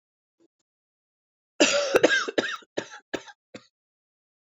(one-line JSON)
{"cough_length": "4.5 s", "cough_amplitude": 22072, "cough_signal_mean_std_ratio": 0.33, "survey_phase": "alpha (2021-03-01 to 2021-08-12)", "age": "45-64", "gender": "Female", "wearing_mask": "No", "symptom_cough_any": true, "symptom_shortness_of_breath": true, "symptom_diarrhoea": true, "symptom_fatigue": true, "symptom_onset": "3 days", "smoker_status": "Ex-smoker", "respiratory_condition_asthma": false, "respiratory_condition_other": false, "recruitment_source": "Test and Trace", "submission_delay": "2 days", "covid_test_result": "Positive", "covid_test_method": "RT-qPCR", "covid_ct_value": 28.9, "covid_ct_gene": "ORF1ab gene", "covid_ct_mean": 29.8, "covid_viral_load": "170 copies/ml", "covid_viral_load_category": "Minimal viral load (< 10K copies/ml)"}